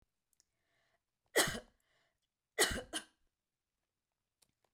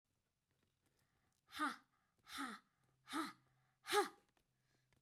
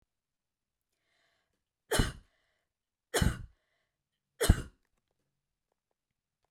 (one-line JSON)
{"cough_length": "4.7 s", "cough_amplitude": 5269, "cough_signal_mean_std_ratio": 0.24, "exhalation_length": "5.0 s", "exhalation_amplitude": 2102, "exhalation_signal_mean_std_ratio": 0.3, "three_cough_length": "6.5 s", "three_cough_amplitude": 14928, "three_cough_signal_mean_std_ratio": 0.2, "survey_phase": "beta (2021-08-13 to 2022-03-07)", "age": "45-64", "gender": "Female", "wearing_mask": "No", "symptom_cough_any": true, "symptom_runny_or_blocked_nose": true, "symptom_onset": "5 days", "smoker_status": "Never smoked", "respiratory_condition_asthma": false, "respiratory_condition_other": false, "recruitment_source": "REACT", "submission_delay": "1 day", "covid_test_result": "Negative", "covid_test_method": "RT-qPCR"}